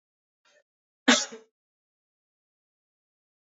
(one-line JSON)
{"cough_length": "3.6 s", "cough_amplitude": 17156, "cough_signal_mean_std_ratio": 0.16, "survey_phase": "beta (2021-08-13 to 2022-03-07)", "age": "18-44", "gender": "Male", "wearing_mask": "No", "symptom_cough_any": true, "symptom_new_continuous_cough": true, "symptom_runny_or_blocked_nose": true, "symptom_sore_throat": true, "symptom_fatigue": true, "symptom_fever_high_temperature": true, "symptom_headache": true, "symptom_change_to_sense_of_smell_or_taste": true, "symptom_loss_of_taste": true, "symptom_onset": "4 days", "smoker_status": "Ex-smoker", "respiratory_condition_asthma": false, "respiratory_condition_other": false, "recruitment_source": "Test and Trace", "submission_delay": "1 day", "covid_test_result": "Positive", "covid_test_method": "RT-qPCR"}